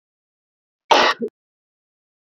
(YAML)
cough_length: 2.3 s
cough_amplitude: 28095
cough_signal_mean_std_ratio: 0.27
survey_phase: beta (2021-08-13 to 2022-03-07)
age: 18-44
gender: Female
wearing_mask: 'No'
symptom_shortness_of_breath: true
symptom_abdominal_pain: true
symptom_diarrhoea: true
symptom_fatigue: true
symptom_headache: true
symptom_other: true
symptom_onset: 5 days
smoker_status: Ex-smoker
respiratory_condition_asthma: true
respiratory_condition_other: false
recruitment_source: REACT
submission_delay: 1 day
covid_test_result: Negative
covid_test_method: RT-qPCR